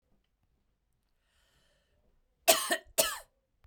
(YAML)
cough_length: 3.7 s
cough_amplitude: 16266
cough_signal_mean_std_ratio: 0.24
survey_phase: beta (2021-08-13 to 2022-03-07)
age: 18-44
gender: Female
wearing_mask: 'No'
symptom_none: true
symptom_onset: 5 days
smoker_status: Ex-smoker
respiratory_condition_asthma: false
respiratory_condition_other: false
recruitment_source: REACT
submission_delay: 1 day
covid_test_result: Negative
covid_test_method: RT-qPCR
influenza_a_test_result: Unknown/Void
influenza_b_test_result: Unknown/Void